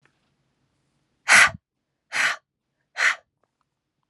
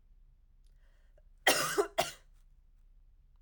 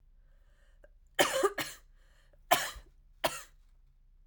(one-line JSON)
{"exhalation_length": "4.1 s", "exhalation_amplitude": 25322, "exhalation_signal_mean_std_ratio": 0.27, "cough_length": "3.4 s", "cough_amplitude": 8646, "cough_signal_mean_std_ratio": 0.33, "three_cough_length": "4.3 s", "three_cough_amplitude": 11345, "three_cough_signal_mean_std_ratio": 0.33, "survey_phase": "alpha (2021-03-01 to 2021-08-12)", "age": "18-44", "gender": "Female", "wearing_mask": "No", "symptom_cough_any": true, "symptom_fatigue": true, "symptom_onset": "5 days", "smoker_status": "Ex-smoker", "respiratory_condition_asthma": false, "respiratory_condition_other": false, "recruitment_source": "Test and Trace", "submission_delay": "1 day", "covid_test_result": "Positive", "covid_test_method": "RT-qPCR", "covid_ct_value": 27.2, "covid_ct_gene": "N gene"}